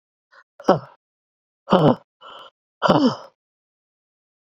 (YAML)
exhalation_length: 4.4 s
exhalation_amplitude: 27554
exhalation_signal_mean_std_ratio: 0.31
survey_phase: beta (2021-08-13 to 2022-03-07)
age: 65+
gender: Female
wearing_mask: 'No'
symptom_runny_or_blocked_nose: true
symptom_headache: true
symptom_other: true
smoker_status: Ex-smoker
respiratory_condition_asthma: false
respiratory_condition_other: false
recruitment_source: Test and Trace
submission_delay: 2 days
covid_test_result: Positive
covid_test_method: RT-qPCR
covid_ct_value: 33.6
covid_ct_gene: N gene